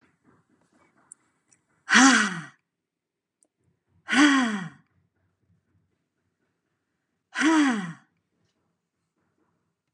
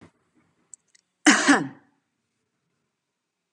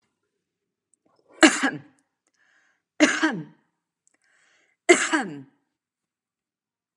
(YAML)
exhalation_length: 9.9 s
exhalation_amplitude: 21442
exhalation_signal_mean_std_ratio: 0.3
cough_length: 3.5 s
cough_amplitude: 29434
cough_signal_mean_std_ratio: 0.24
three_cough_length: 7.0 s
three_cough_amplitude: 30546
three_cough_signal_mean_std_ratio: 0.26
survey_phase: beta (2021-08-13 to 2022-03-07)
age: 18-44
gender: Female
wearing_mask: 'No'
symptom_none: true
smoker_status: Never smoked
respiratory_condition_asthma: false
respiratory_condition_other: false
recruitment_source: REACT
submission_delay: 2 days
covid_test_result: Negative
covid_test_method: RT-qPCR